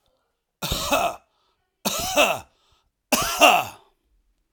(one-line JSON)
{"three_cough_length": "4.5 s", "three_cough_amplitude": 32316, "three_cough_signal_mean_std_ratio": 0.42, "survey_phase": "beta (2021-08-13 to 2022-03-07)", "age": "45-64", "gender": "Male", "wearing_mask": "No", "symptom_none": true, "smoker_status": "Ex-smoker", "respiratory_condition_asthma": false, "respiratory_condition_other": false, "recruitment_source": "REACT", "submission_delay": "3 days", "covid_test_result": "Negative", "covid_test_method": "RT-qPCR", "influenza_a_test_result": "Negative", "influenza_b_test_result": "Negative"}